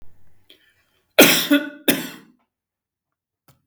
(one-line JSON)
{"cough_length": "3.7 s", "cough_amplitude": 32768, "cough_signal_mean_std_ratio": 0.3, "survey_phase": "beta (2021-08-13 to 2022-03-07)", "age": "65+", "gender": "Male", "wearing_mask": "No", "symptom_none": true, "smoker_status": "Never smoked", "respiratory_condition_asthma": false, "respiratory_condition_other": false, "recruitment_source": "REACT", "submission_delay": "3 days", "covid_test_result": "Negative", "covid_test_method": "RT-qPCR", "influenza_a_test_result": "Negative", "influenza_b_test_result": "Negative"}